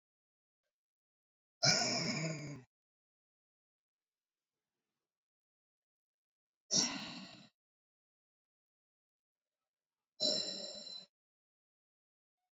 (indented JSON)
{
  "exhalation_length": "12.5 s",
  "exhalation_amplitude": 4512,
  "exhalation_signal_mean_std_ratio": 0.29,
  "survey_phase": "beta (2021-08-13 to 2022-03-07)",
  "age": "45-64",
  "gender": "Female",
  "wearing_mask": "No",
  "symptom_none": true,
  "smoker_status": "Ex-smoker",
  "respiratory_condition_asthma": false,
  "respiratory_condition_other": false,
  "recruitment_source": "REACT",
  "submission_delay": "3 days",
  "covid_test_result": "Negative",
  "covid_test_method": "RT-qPCR",
  "influenza_a_test_result": "Negative",
  "influenza_b_test_result": "Negative"
}